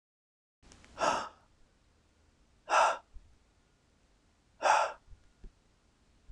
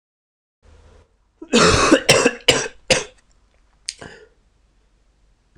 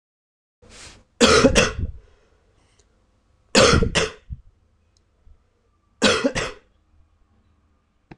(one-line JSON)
{"exhalation_length": "6.3 s", "exhalation_amplitude": 7573, "exhalation_signal_mean_std_ratio": 0.3, "cough_length": "5.6 s", "cough_amplitude": 26028, "cough_signal_mean_std_ratio": 0.34, "three_cough_length": "8.2 s", "three_cough_amplitude": 26028, "three_cough_signal_mean_std_ratio": 0.34, "survey_phase": "alpha (2021-03-01 to 2021-08-12)", "age": "18-44", "gender": "Male", "wearing_mask": "No", "symptom_cough_any": true, "symptom_new_continuous_cough": true, "symptom_fatigue": true, "symptom_onset": "2 days", "smoker_status": "Never smoked", "respiratory_condition_asthma": false, "respiratory_condition_other": false, "recruitment_source": "Test and Trace", "submission_delay": "1 day", "covid_test_result": "Positive", "covid_test_method": "RT-qPCR", "covid_ct_value": 15.4, "covid_ct_gene": "ORF1ab gene", "covid_ct_mean": 15.7, "covid_viral_load": "6900000 copies/ml", "covid_viral_load_category": "High viral load (>1M copies/ml)"}